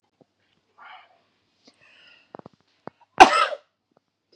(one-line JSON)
{"cough_length": "4.4 s", "cough_amplitude": 32768, "cough_signal_mean_std_ratio": 0.17, "survey_phase": "beta (2021-08-13 to 2022-03-07)", "age": "45-64", "gender": "Female", "wearing_mask": "No", "symptom_none": true, "smoker_status": "Ex-smoker", "respiratory_condition_asthma": false, "respiratory_condition_other": false, "recruitment_source": "REACT", "submission_delay": "2 days", "covid_test_result": "Negative", "covid_test_method": "RT-qPCR", "influenza_a_test_result": "Negative", "influenza_b_test_result": "Negative"}